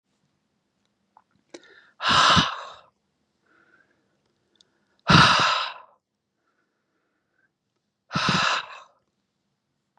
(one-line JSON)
{"exhalation_length": "10.0 s", "exhalation_amplitude": 27335, "exhalation_signal_mean_std_ratio": 0.31, "survey_phase": "beta (2021-08-13 to 2022-03-07)", "age": "45-64", "gender": "Male", "wearing_mask": "No", "symptom_cough_any": true, "symptom_runny_or_blocked_nose": true, "symptom_onset": "12 days", "smoker_status": "Never smoked", "respiratory_condition_asthma": false, "respiratory_condition_other": false, "recruitment_source": "REACT", "submission_delay": "3 days", "covid_test_result": "Negative", "covid_test_method": "RT-qPCR", "influenza_a_test_result": "Negative", "influenza_b_test_result": "Negative"}